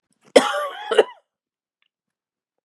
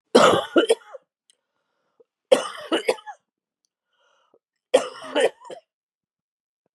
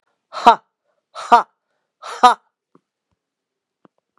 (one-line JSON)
{"cough_length": "2.6 s", "cough_amplitude": 32768, "cough_signal_mean_std_ratio": 0.27, "three_cough_length": "6.7 s", "three_cough_amplitude": 29166, "three_cough_signal_mean_std_ratio": 0.3, "exhalation_length": "4.2 s", "exhalation_amplitude": 32768, "exhalation_signal_mean_std_ratio": 0.23, "survey_phase": "beta (2021-08-13 to 2022-03-07)", "age": "65+", "gender": "Female", "wearing_mask": "No", "symptom_cough_any": true, "symptom_runny_or_blocked_nose": true, "symptom_sore_throat": true, "symptom_headache": true, "smoker_status": "Never smoked", "respiratory_condition_asthma": false, "respiratory_condition_other": false, "recruitment_source": "Test and Trace", "submission_delay": "2 days", "covid_test_result": "Positive", "covid_test_method": "LFT"}